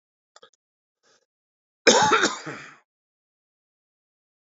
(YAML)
cough_length: 4.4 s
cough_amplitude: 27853
cough_signal_mean_std_ratio: 0.27
survey_phase: beta (2021-08-13 to 2022-03-07)
age: 45-64
gender: Male
wearing_mask: 'No'
symptom_none: true
smoker_status: Current smoker (11 or more cigarettes per day)
respiratory_condition_asthma: true
respiratory_condition_other: true
recruitment_source: REACT
submission_delay: 1 day
covid_test_result: Negative
covid_test_method: RT-qPCR
influenza_a_test_result: Negative
influenza_b_test_result: Negative